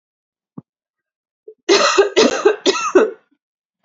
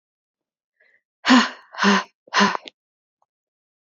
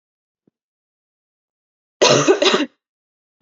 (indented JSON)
{
  "three_cough_length": "3.8 s",
  "three_cough_amplitude": 32767,
  "three_cough_signal_mean_std_ratio": 0.43,
  "exhalation_length": "3.8 s",
  "exhalation_amplitude": 27767,
  "exhalation_signal_mean_std_ratio": 0.33,
  "cough_length": "3.4 s",
  "cough_amplitude": 31341,
  "cough_signal_mean_std_ratio": 0.33,
  "survey_phase": "beta (2021-08-13 to 2022-03-07)",
  "age": "18-44",
  "gender": "Female",
  "wearing_mask": "No",
  "symptom_cough_any": true,
  "symptom_runny_or_blocked_nose": true,
  "symptom_shortness_of_breath": true,
  "symptom_sore_throat": true,
  "symptom_fatigue": true,
  "symptom_fever_high_temperature": true,
  "symptom_headache": true,
  "symptom_other": true,
  "symptom_onset": "2 days",
  "smoker_status": "Ex-smoker",
  "respiratory_condition_asthma": false,
  "respiratory_condition_other": false,
  "recruitment_source": "Test and Trace",
  "submission_delay": "2 days",
  "covid_test_result": "Positive",
  "covid_test_method": "RT-qPCR",
  "covid_ct_value": 32.5,
  "covid_ct_gene": "N gene"
}